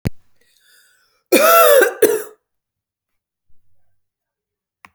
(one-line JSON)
{"cough_length": "4.9 s", "cough_amplitude": 32768, "cough_signal_mean_std_ratio": 0.34, "survey_phase": "alpha (2021-03-01 to 2021-08-12)", "age": "18-44", "gender": "Female", "wearing_mask": "No", "symptom_none": true, "smoker_status": "Never smoked", "respiratory_condition_asthma": false, "respiratory_condition_other": false, "recruitment_source": "REACT", "submission_delay": "1 day", "covid_test_result": "Negative", "covid_test_method": "RT-qPCR"}